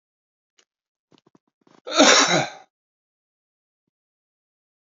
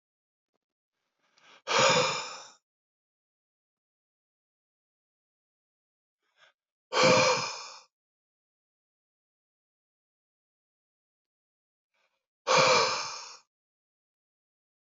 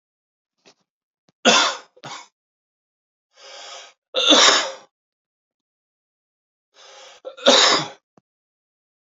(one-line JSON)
{"cough_length": "4.9 s", "cough_amplitude": 28962, "cough_signal_mean_std_ratio": 0.25, "exhalation_length": "14.9 s", "exhalation_amplitude": 11524, "exhalation_signal_mean_std_ratio": 0.27, "three_cough_length": "9.0 s", "three_cough_amplitude": 31092, "three_cough_signal_mean_std_ratio": 0.3, "survey_phase": "beta (2021-08-13 to 2022-03-07)", "age": "18-44", "gender": "Male", "wearing_mask": "No", "symptom_runny_or_blocked_nose": true, "symptom_headache": true, "symptom_change_to_sense_of_smell_or_taste": true, "symptom_loss_of_taste": true, "symptom_onset": "6 days", "smoker_status": "Never smoked", "respiratory_condition_asthma": false, "respiratory_condition_other": false, "recruitment_source": "Test and Trace", "submission_delay": "1 day", "covid_test_result": "Positive", "covid_test_method": "RT-qPCR", "covid_ct_value": 18.7, "covid_ct_gene": "ORF1ab gene", "covid_ct_mean": 18.9, "covid_viral_load": "640000 copies/ml", "covid_viral_load_category": "Low viral load (10K-1M copies/ml)"}